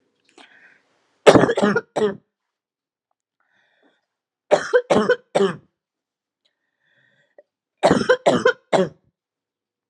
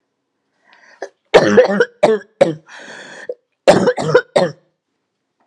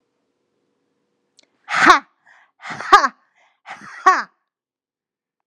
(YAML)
three_cough_length: 9.9 s
three_cough_amplitude: 32768
three_cough_signal_mean_std_ratio: 0.33
cough_length: 5.5 s
cough_amplitude: 32768
cough_signal_mean_std_ratio: 0.4
exhalation_length: 5.5 s
exhalation_amplitude: 32768
exhalation_signal_mean_std_ratio: 0.25
survey_phase: alpha (2021-03-01 to 2021-08-12)
age: 18-44
gender: Female
wearing_mask: 'No'
symptom_cough_any: true
symptom_new_continuous_cough: true
symptom_headache: true
symptom_onset: 22 days
smoker_status: Current smoker (1 to 10 cigarettes per day)
respiratory_condition_asthma: false
respiratory_condition_other: false
recruitment_source: Test and Trace
submission_delay: 0 days